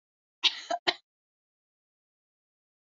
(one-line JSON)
{"cough_length": "2.9 s", "cough_amplitude": 13138, "cough_signal_mean_std_ratio": 0.2, "survey_phase": "alpha (2021-03-01 to 2021-08-12)", "age": "18-44", "gender": "Female", "wearing_mask": "No", "symptom_none": true, "smoker_status": "Never smoked", "respiratory_condition_asthma": true, "respiratory_condition_other": false, "recruitment_source": "REACT", "submission_delay": "1 day", "covid_test_result": "Negative", "covid_test_method": "RT-qPCR"}